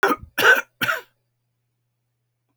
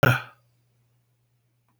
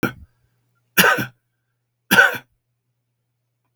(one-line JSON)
{"cough_length": "2.6 s", "cough_amplitude": 26519, "cough_signal_mean_std_ratio": 0.34, "exhalation_length": "1.8 s", "exhalation_amplitude": 25720, "exhalation_signal_mean_std_ratio": 0.23, "three_cough_length": "3.8 s", "three_cough_amplitude": 32768, "three_cough_signal_mean_std_ratio": 0.29, "survey_phase": "beta (2021-08-13 to 2022-03-07)", "age": "65+", "gender": "Male", "wearing_mask": "No", "symptom_none": true, "smoker_status": "Never smoked", "respiratory_condition_asthma": false, "respiratory_condition_other": false, "recruitment_source": "REACT", "submission_delay": "5 days", "covid_test_result": "Negative", "covid_test_method": "RT-qPCR"}